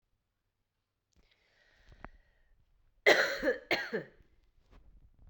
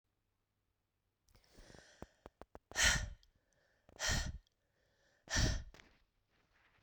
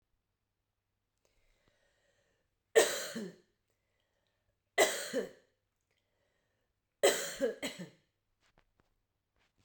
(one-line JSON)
{"cough_length": "5.3 s", "cough_amplitude": 11985, "cough_signal_mean_std_ratio": 0.28, "exhalation_length": "6.8 s", "exhalation_amplitude": 4271, "exhalation_signal_mean_std_ratio": 0.32, "three_cough_length": "9.6 s", "three_cough_amplitude": 8690, "three_cough_signal_mean_std_ratio": 0.25, "survey_phase": "beta (2021-08-13 to 2022-03-07)", "age": "18-44", "gender": "Female", "wearing_mask": "No", "symptom_fatigue": true, "symptom_fever_high_temperature": true, "symptom_headache": true, "symptom_onset": "3 days", "smoker_status": "Never smoked", "respiratory_condition_asthma": false, "respiratory_condition_other": false, "recruitment_source": "Test and Trace", "submission_delay": "2 days", "covid_test_result": "Positive", "covid_test_method": "RT-qPCR"}